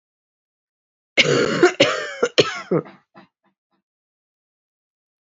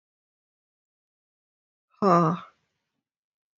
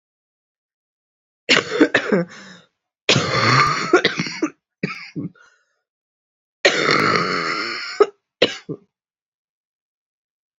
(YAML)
cough_length: 5.2 s
cough_amplitude: 30616
cough_signal_mean_std_ratio: 0.34
exhalation_length: 3.6 s
exhalation_amplitude: 14352
exhalation_signal_mean_std_ratio: 0.24
three_cough_length: 10.6 s
three_cough_amplitude: 29851
three_cough_signal_mean_std_ratio: 0.43
survey_phase: beta (2021-08-13 to 2022-03-07)
age: 18-44
gender: Female
wearing_mask: 'No'
symptom_cough_any: true
symptom_runny_or_blocked_nose: true
symptom_abdominal_pain: true
symptom_fatigue: true
symptom_headache: true
smoker_status: Never smoked
respiratory_condition_asthma: false
respiratory_condition_other: false
recruitment_source: Test and Trace
submission_delay: 1 day
covid_test_result: Positive
covid_test_method: RT-qPCR
covid_ct_value: 21.0
covid_ct_gene: ORF1ab gene
covid_ct_mean: 21.3
covid_viral_load: 100000 copies/ml
covid_viral_load_category: Low viral load (10K-1M copies/ml)